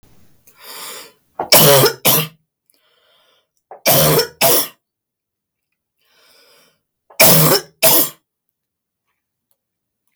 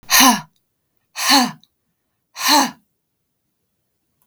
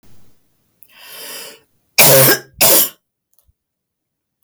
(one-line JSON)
{"three_cough_length": "10.2 s", "three_cough_amplitude": 32768, "three_cough_signal_mean_std_ratio": 0.39, "exhalation_length": "4.3 s", "exhalation_amplitude": 32766, "exhalation_signal_mean_std_ratio": 0.36, "cough_length": "4.4 s", "cough_amplitude": 32768, "cough_signal_mean_std_ratio": 0.38, "survey_phase": "beta (2021-08-13 to 2022-03-07)", "age": "45-64", "gender": "Female", "wearing_mask": "No", "symptom_none": true, "smoker_status": "Never smoked", "respiratory_condition_asthma": false, "respiratory_condition_other": false, "recruitment_source": "REACT", "submission_delay": "2 days", "covid_test_result": "Negative", "covid_test_method": "RT-qPCR", "influenza_a_test_result": "Unknown/Void", "influenza_b_test_result": "Unknown/Void"}